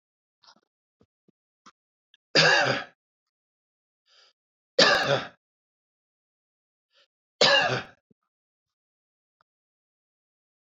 {"three_cough_length": "10.8 s", "three_cough_amplitude": 19028, "three_cough_signal_mean_std_ratio": 0.27, "survey_phase": "beta (2021-08-13 to 2022-03-07)", "age": "65+", "gender": "Male", "wearing_mask": "No", "symptom_cough_any": true, "smoker_status": "Ex-smoker", "respiratory_condition_asthma": false, "respiratory_condition_other": false, "recruitment_source": "REACT", "submission_delay": "1 day", "covid_test_result": "Negative", "covid_test_method": "RT-qPCR", "influenza_a_test_result": "Unknown/Void", "influenza_b_test_result": "Unknown/Void"}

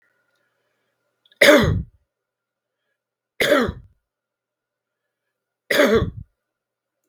{"three_cough_length": "7.1 s", "three_cough_amplitude": 32768, "three_cough_signal_mean_std_ratio": 0.3, "survey_phase": "beta (2021-08-13 to 2022-03-07)", "age": "65+", "gender": "Male", "wearing_mask": "No", "symptom_runny_or_blocked_nose": true, "smoker_status": "Never smoked", "respiratory_condition_asthma": false, "respiratory_condition_other": false, "recruitment_source": "REACT", "submission_delay": "2 days", "covid_test_result": "Negative", "covid_test_method": "RT-qPCR", "influenza_a_test_result": "Negative", "influenza_b_test_result": "Negative"}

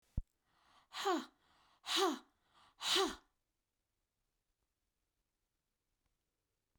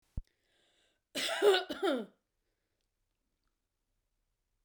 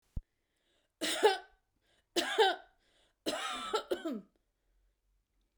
{"exhalation_length": "6.8 s", "exhalation_amplitude": 2968, "exhalation_signal_mean_std_ratio": 0.3, "cough_length": "4.6 s", "cough_amplitude": 6693, "cough_signal_mean_std_ratio": 0.3, "three_cough_length": "5.6 s", "three_cough_amplitude": 7992, "three_cough_signal_mean_std_ratio": 0.37, "survey_phase": "beta (2021-08-13 to 2022-03-07)", "age": "45-64", "gender": "Female", "wearing_mask": "No", "symptom_none": true, "smoker_status": "Ex-smoker", "respiratory_condition_asthma": false, "respiratory_condition_other": false, "recruitment_source": "REACT", "submission_delay": "3 days", "covid_test_result": "Negative", "covid_test_method": "RT-qPCR"}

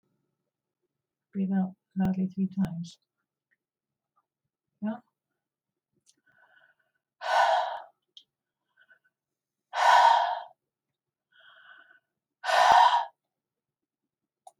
{"exhalation_length": "14.6 s", "exhalation_amplitude": 14916, "exhalation_signal_mean_std_ratio": 0.34, "survey_phase": "beta (2021-08-13 to 2022-03-07)", "age": "65+", "gender": "Female", "wearing_mask": "No", "symptom_none": true, "smoker_status": "Never smoked", "respiratory_condition_asthma": false, "respiratory_condition_other": false, "recruitment_source": "Test and Trace", "submission_delay": "0 days", "covid_test_result": "Negative", "covid_test_method": "LFT"}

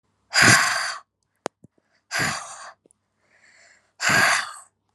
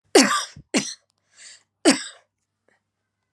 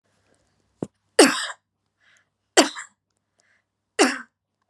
{"exhalation_length": "4.9 s", "exhalation_amplitude": 27694, "exhalation_signal_mean_std_ratio": 0.4, "cough_length": "3.3 s", "cough_amplitude": 28617, "cough_signal_mean_std_ratio": 0.3, "three_cough_length": "4.7 s", "three_cough_amplitude": 32767, "three_cough_signal_mean_std_ratio": 0.24, "survey_phase": "alpha (2021-03-01 to 2021-08-12)", "age": "18-44", "gender": "Female", "wearing_mask": "No", "symptom_cough_any": true, "symptom_shortness_of_breath": true, "symptom_fatigue": true, "smoker_status": "Never smoked", "respiratory_condition_asthma": false, "respiratory_condition_other": false, "recruitment_source": "Test and Trace", "submission_delay": "2 days", "covid_test_result": "Positive", "covid_test_method": "RT-qPCR", "covid_ct_value": 23.7, "covid_ct_gene": "ORF1ab gene", "covid_ct_mean": 24.4, "covid_viral_load": "10000 copies/ml", "covid_viral_load_category": "Low viral load (10K-1M copies/ml)"}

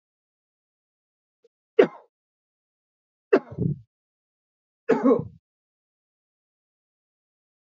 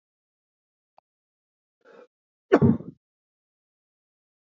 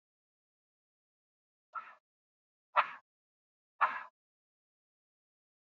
{"three_cough_length": "7.8 s", "three_cough_amplitude": 25506, "three_cough_signal_mean_std_ratio": 0.2, "cough_length": "4.5 s", "cough_amplitude": 22708, "cough_signal_mean_std_ratio": 0.17, "exhalation_length": "5.6 s", "exhalation_amplitude": 8399, "exhalation_signal_mean_std_ratio": 0.17, "survey_phase": "alpha (2021-03-01 to 2021-08-12)", "age": "45-64", "gender": "Male", "wearing_mask": "No", "symptom_fatigue": true, "symptom_headache": true, "symptom_loss_of_taste": true, "symptom_onset": "5 days", "smoker_status": "Never smoked", "respiratory_condition_asthma": false, "respiratory_condition_other": false, "recruitment_source": "Test and Trace", "submission_delay": "2 days", "covid_test_result": "Positive", "covid_test_method": "RT-qPCR", "covid_ct_value": 21.5, "covid_ct_gene": "ORF1ab gene", "covid_ct_mean": 21.9, "covid_viral_load": "65000 copies/ml", "covid_viral_load_category": "Low viral load (10K-1M copies/ml)"}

